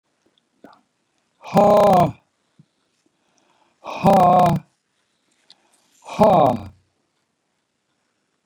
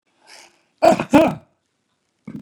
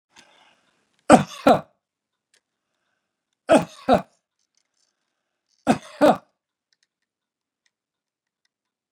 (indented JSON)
{
  "exhalation_length": "8.5 s",
  "exhalation_amplitude": 27771,
  "exhalation_signal_mean_std_ratio": 0.37,
  "cough_length": "2.4 s",
  "cough_amplitude": 31839,
  "cough_signal_mean_std_ratio": 0.32,
  "three_cough_length": "8.9 s",
  "three_cough_amplitude": 32768,
  "three_cough_signal_mean_std_ratio": 0.22,
  "survey_phase": "beta (2021-08-13 to 2022-03-07)",
  "age": "65+",
  "gender": "Male",
  "wearing_mask": "No",
  "symptom_runny_or_blocked_nose": true,
  "smoker_status": "Ex-smoker",
  "respiratory_condition_asthma": false,
  "respiratory_condition_other": false,
  "recruitment_source": "REACT",
  "submission_delay": "1 day",
  "covid_test_result": "Negative",
  "covid_test_method": "RT-qPCR",
  "influenza_a_test_result": "Negative",
  "influenza_b_test_result": "Negative"
}